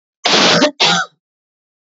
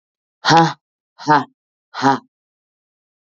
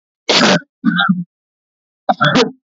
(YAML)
cough_length: 1.9 s
cough_amplitude: 29807
cough_signal_mean_std_ratio: 0.54
exhalation_length: 3.2 s
exhalation_amplitude: 32767
exhalation_signal_mean_std_ratio: 0.34
three_cough_length: 2.6 s
three_cough_amplitude: 32768
three_cough_signal_mean_std_ratio: 0.53
survey_phase: beta (2021-08-13 to 2022-03-07)
age: 18-44
gender: Female
wearing_mask: 'No'
symptom_fatigue: true
smoker_status: Current smoker (1 to 10 cigarettes per day)
respiratory_condition_asthma: false
respiratory_condition_other: false
recruitment_source: Test and Trace
submission_delay: 2 days
covid_test_result: Positive
covid_test_method: LFT